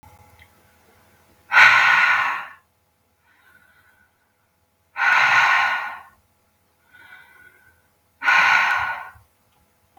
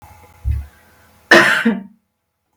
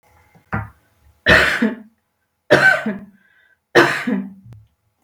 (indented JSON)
{
  "exhalation_length": "10.0 s",
  "exhalation_amplitude": 32768,
  "exhalation_signal_mean_std_ratio": 0.42,
  "cough_length": "2.6 s",
  "cough_amplitude": 32768,
  "cough_signal_mean_std_ratio": 0.39,
  "three_cough_length": "5.0 s",
  "three_cough_amplitude": 32768,
  "three_cough_signal_mean_std_ratio": 0.41,
  "survey_phase": "beta (2021-08-13 to 2022-03-07)",
  "age": "45-64",
  "gender": "Female",
  "wearing_mask": "No",
  "symptom_none": true,
  "smoker_status": "Ex-smoker",
  "respiratory_condition_asthma": false,
  "respiratory_condition_other": false,
  "recruitment_source": "REACT",
  "submission_delay": "2 days",
  "covid_test_result": "Negative",
  "covid_test_method": "RT-qPCR",
  "influenza_a_test_result": "Negative",
  "influenza_b_test_result": "Negative"
}